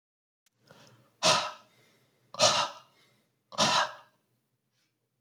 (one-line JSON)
{"exhalation_length": "5.2 s", "exhalation_amplitude": 12200, "exhalation_signal_mean_std_ratio": 0.33, "survey_phase": "beta (2021-08-13 to 2022-03-07)", "age": "18-44", "gender": "Male", "wearing_mask": "No", "symptom_cough_any": true, "symptom_runny_or_blocked_nose": true, "symptom_fever_high_temperature": true, "smoker_status": "Never smoked", "respiratory_condition_asthma": false, "respiratory_condition_other": false, "recruitment_source": "Test and Trace", "submission_delay": "2 days", "covid_test_result": "Positive", "covid_test_method": "RT-qPCR", "covid_ct_value": 27.8, "covid_ct_gene": "ORF1ab gene", "covid_ct_mean": 29.0, "covid_viral_load": "300 copies/ml", "covid_viral_load_category": "Minimal viral load (< 10K copies/ml)"}